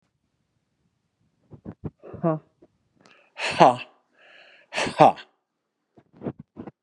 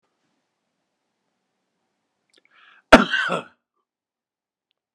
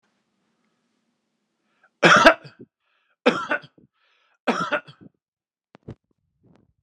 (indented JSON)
{
  "exhalation_length": "6.8 s",
  "exhalation_amplitude": 30822,
  "exhalation_signal_mean_std_ratio": 0.23,
  "cough_length": "4.9 s",
  "cough_amplitude": 32768,
  "cough_signal_mean_std_ratio": 0.17,
  "three_cough_length": "6.8 s",
  "three_cough_amplitude": 32767,
  "three_cough_signal_mean_std_ratio": 0.24,
  "survey_phase": "beta (2021-08-13 to 2022-03-07)",
  "age": "45-64",
  "gender": "Male",
  "wearing_mask": "No",
  "symptom_none": true,
  "symptom_onset": "8 days",
  "smoker_status": "Ex-smoker",
  "respiratory_condition_asthma": false,
  "respiratory_condition_other": false,
  "recruitment_source": "REACT",
  "submission_delay": "4 days",
  "covid_test_result": "Negative",
  "covid_test_method": "RT-qPCR"
}